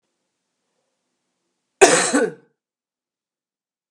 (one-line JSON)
{"cough_length": "3.9 s", "cough_amplitude": 32768, "cough_signal_mean_std_ratio": 0.25, "survey_phase": "beta (2021-08-13 to 2022-03-07)", "age": "65+", "gender": "Female", "wearing_mask": "No", "symptom_runny_or_blocked_nose": true, "smoker_status": "Ex-smoker", "respiratory_condition_asthma": false, "respiratory_condition_other": false, "recruitment_source": "REACT", "submission_delay": "3 days", "covid_test_result": "Negative", "covid_test_method": "RT-qPCR", "influenza_a_test_result": "Negative", "influenza_b_test_result": "Negative"}